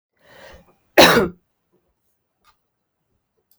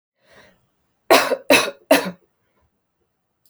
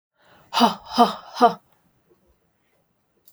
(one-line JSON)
{"cough_length": "3.6 s", "cough_amplitude": 32768, "cough_signal_mean_std_ratio": 0.23, "three_cough_length": "3.5 s", "three_cough_amplitude": 31859, "three_cough_signal_mean_std_ratio": 0.3, "exhalation_length": "3.3 s", "exhalation_amplitude": 31236, "exhalation_signal_mean_std_ratio": 0.3, "survey_phase": "alpha (2021-03-01 to 2021-08-12)", "age": "18-44", "gender": "Female", "wearing_mask": "No", "symptom_none": true, "smoker_status": "Never smoked", "respiratory_condition_asthma": false, "respiratory_condition_other": false, "recruitment_source": "REACT", "submission_delay": "2 days", "covid_test_result": "Negative", "covid_test_method": "RT-qPCR"}